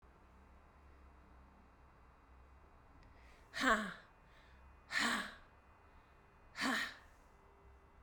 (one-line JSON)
{"exhalation_length": "8.0 s", "exhalation_amplitude": 3553, "exhalation_signal_mean_std_ratio": 0.37, "survey_phase": "beta (2021-08-13 to 2022-03-07)", "age": "18-44", "gender": "Female", "wearing_mask": "No", "symptom_cough_any": true, "symptom_runny_or_blocked_nose": true, "symptom_sore_throat": true, "symptom_fatigue": true, "symptom_change_to_sense_of_smell_or_taste": true, "symptom_loss_of_taste": true, "symptom_onset": "4 days", "smoker_status": "Never smoked", "respiratory_condition_asthma": false, "respiratory_condition_other": false, "recruitment_source": "Test and Trace", "submission_delay": "2 days", "covid_test_result": "Positive", "covid_test_method": "RT-qPCR", "covid_ct_value": 19.0, "covid_ct_gene": "ORF1ab gene", "covid_ct_mean": 19.5, "covid_viral_load": "400000 copies/ml", "covid_viral_load_category": "Low viral load (10K-1M copies/ml)"}